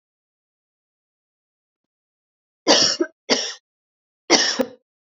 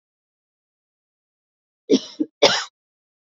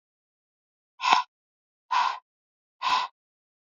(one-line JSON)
{"three_cough_length": "5.1 s", "three_cough_amplitude": 32768, "three_cough_signal_mean_std_ratio": 0.3, "cough_length": "3.3 s", "cough_amplitude": 32767, "cough_signal_mean_std_ratio": 0.23, "exhalation_length": "3.7 s", "exhalation_amplitude": 22301, "exhalation_signal_mean_std_ratio": 0.33, "survey_phase": "beta (2021-08-13 to 2022-03-07)", "age": "18-44", "gender": "Female", "wearing_mask": "No", "symptom_none": true, "smoker_status": "Never smoked", "respiratory_condition_asthma": false, "respiratory_condition_other": false, "recruitment_source": "REACT", "submission_delay": "2 days", "covid_test_result": "Negative", "covid_test_method": "RT-qPCR", "influenza_a_test_result": "Unknown/Void", "influenza_b_test_result": "Unknown/Void"}